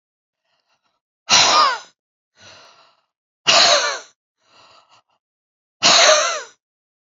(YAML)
exhalation_length: 7.1 s
exhalation_amplitude: 32767
exhalation_signal_mean_std_ratio: 0.38
survey_phase: beta (2021-08-13 to 2022-03-07)
age: 45-64
gender: Female
wearing_mask: 'No'
symptom_cough_any: true
symptom_runny_or_blocked_nose: true
symptom_fatigue: true
symptom_headache: true
symptom_onset: 2 days
smoker_status: Current smoker (e-cigarettes or vapes only)
respiratory_condition_asthma: false
respiratory_condition_other: false
recruitment_source: Test and Trace
submission_delay: 2 days
covid_test_result: Positive
covid_test_method: ePCR